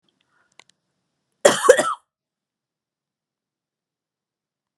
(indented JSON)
{
  "cough_length": "4.8 s",
  "cough_amplitude": 32768,
  "cough_signal_mean_std_ratio": 0.19,
  "survey_phase": "beta (2021-08-13 to 2022-03-07)",
  "age": "65+",
  "gender": "Female",
  "wearing_mask": "No",
  "symptom_none": true,
  "smoker_status": "Never smoked",
  "respiratory_condition_asthma": false,
  "respiratory_condition_other": false,
  "recruitment_source": "REACT",
  "submission_delay": "1 day",
  "covid_test_result": "Negative",
  "covid_test_method": "RT-qPCR"
}